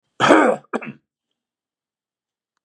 {"cough_length": "2.6 s", "cough_amplitude": 32767, "cough_signal_mean_std_ratio": 0.31, "survey_phase": "beta (2021-08-13 to 2022-03-07)", "age": "45-64", "gender": "Male", "wearing_mask": "No", "symptom_none": true, "smoker_status": "Never smoked", "respiratory_condition_asthma": false, "respiratory_condition_other": false, "recruitment_source": "REACT", "submission_delay": "2 days", "covid_test_result": "Negative", "covid_test_method": "RT-qPCR", "influenza_a_test_result": "Negative", "influenza_b_test_result": "Negative"}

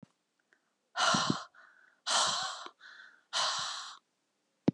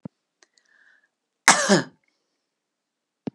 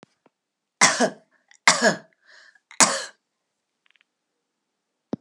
{"exhalation_length": "4.7 s", "exhalation_amplitude": 6825, "exhalation_signal_mean_std_ratio": 0.45, "cough_length": "3.3 s", "cough_amplitude": 32768, "cough_signal_mean_std_ratio": 0.23, "three_cough_length": "5.2 s", "three_cough_amplitude": 32768, "three_cough_signal_mean_std_ratio": 0.27, "survey_phase": "beta (2021-08-13 to 2022-03-07)", "age": "65+", "gender": "Female", "wearing_mask": "No", "symptom_none": true, "smoker_status": "Current smoker (1 to 10 cigarettes per day)", "respiratory_condition_asthma": false, "respiratory_condition_other": false, "recruitment_source": "REACT", "submission_delay": "1 day", "covid_test_result": "Negative", "covid_test_method": "RT-qPCR", "influenza_a_test_result": "Negative", "influenza_b_test_result": "Negative"}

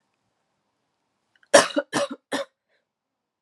{"three_cough_length": "3.4 s", "three_cough_amplitude": 31986, "three_cough_signal_mean_std_ratio": 0.23, "survey_phase": "alpha (2021-03-01 to 2021-08-12)", "age": "18-44", "gender": "Female", "wearing_mask": "No", "symptom_cough_any": true, "symptom_new_continuous_cough": true, "symptom_headache": true, "smoker_status": "Never smoked", "respiratory_condition_asthma": false, "respiratory_condition_other": false, "recruitment_source": "Test and Trace", "submission_delay": "2 days", "covid_test_result": "Positive", "covid_test_method": "LFT"}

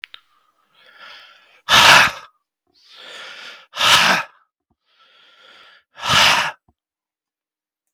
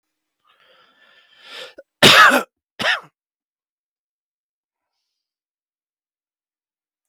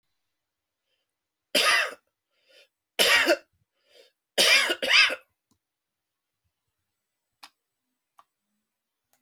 {"exhalation_length": "7.9 s", "exhalation_amplitude": 32768, "exhalation_signal_mean_std_ratio": 0.34, "cough_length": "7.1 s", "cough_amplitude": 32768, "cough_signal_mean_std_ratio": 0.22, "three_cough_length": "9.2 s", "three_cough_amplitude": 17971, "three_cough_signal_mean_std_ratio": 0.31, "survey_phase": "beta (2021-08-13 to 2022-03-07)", "age": "65+", "gender": "Male", "wearing_mask": "No", "symptom_none": true, "symptom_onset": "13 days", "smoker_status": "Never smoked", "respiratory_condition_asthma": false, "respiratory_condition_other": false, "recruitment_source": "REACT", "submission_delay": "1 day", "covid_test_result": "Negative", "covid_test_method": "RT-qPCR"}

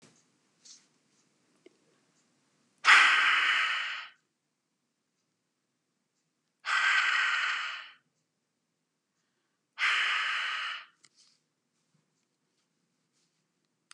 {"exhalation_length": "13.9 s", "exhalation_amplitude": 16074, "exhalation_signal_mean_std_ratio": 0.36, "survey_phase": "beta (2021-08-13 to 2022-03-07)", "age": "65+", "gender": "Female", "wearing_mask": "No", "symptom_none": true, "smoker_status": "Never smoked", "respiratory_condition_asthma": false, "respiratory_condition_other": false, "recruitment_source": "REACT", "submission_delay": "1 day", "covid_test_result": "Negative", "covid_test_method": "RT-qPCR", "influenza_a_test_result": "Negative", "influenza_b_test_result": "Negative"}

